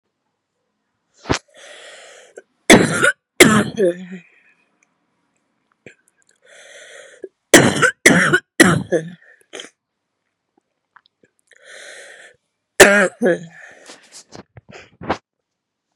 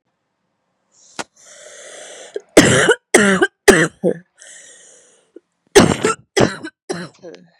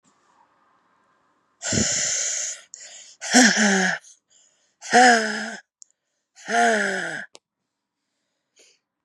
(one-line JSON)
{"three_cough_length": "16.0 s", "three_cough_amplitude": 32768, "three_cough_signal_mean_std_ratio": 0.3, "cough_length": "7.6 s", "cough_amplitude": 32768, "cough_signal_mean_std_ratio": 0.36, "exhalation_length": "9.0 s", "exhalation_amplitude": 28117, "exhalation_signal_mean_std_ratio": 0.43, "survey_phase": "beta (2021-08-13 to 2022-03-07)", "age": "18-44", "gender": "Female", "wearing_mask": "No", "symptom_cough_any": true, "symptom_new_continuous_cough": true, "symptom_runny_or_blocked_nose": true, "symptom_shortness_of_breath": true, "symptom_sore_throat": true, "symptom_fatigue": true, "symptom_headache": true, "symptom_change_to_sense_of_smell_or_taste": true, "symptom_loss_of_taste": true, "symptom_onset": "3 days", "smoker_status": "Never smoked", "respiratory_condition_asthma": true, "respiratory_condition_other": false, "recruitment_source": "Test and Trace", "submission_delay": "1 day", "covid_test_result": "Negative", "covid_test_method": "RT-qPCR"}